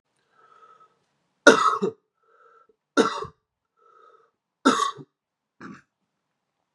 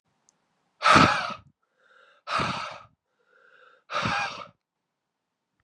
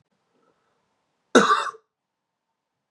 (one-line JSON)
{"three_cough_length": "6.7 s", "three_cough_amplitude": 32647, "three_cough_signal_mean_std_ratio": 0.25, "exhalation_length": "5.6 s", "exhalation_amplitude": 21171, "exhalation_signal_mean_std_ratio": 0.33, "cough_length": "2.9 s", "cough_amplitude": 31689, "cough_signal_mean_std_ratio": 0.24, "survey_phase": "beta (2021-08-13 to 2022-03-07)", "age": "18-44", "gender": "Male", "wearing_mask": "No", "symptom_cough_any": true, "symptom_new_continuous_cough": true, "symptom_runny_or_blocked_nose": true, "symptom_sore_throat": true, "symptom_fatigue": true, "symptom_fever_high_temperature": true, "symptom_headache": true, "symptom_change_to_sense_of_smell_or_taste": true, "symptom_onset": "3 days", "smoker_status": "Never smoked", "respiratory_condition_asthma": false, "respiratory_condition_other": false, "recruitment_source": "Test and Trace", "submission_delay": "1 day", "covid_test_result": "Positive", "covid_test_method": "RT-qPCR", "covid_ct_value": 17.2, "covid_ct_gene": "ORF1ab gene", "covid_ct_mean": 17.6, "covid_viral_load": "1700000 copies/ml", "covid_viral_load_category": "High viral load (>1M copies/ml)"}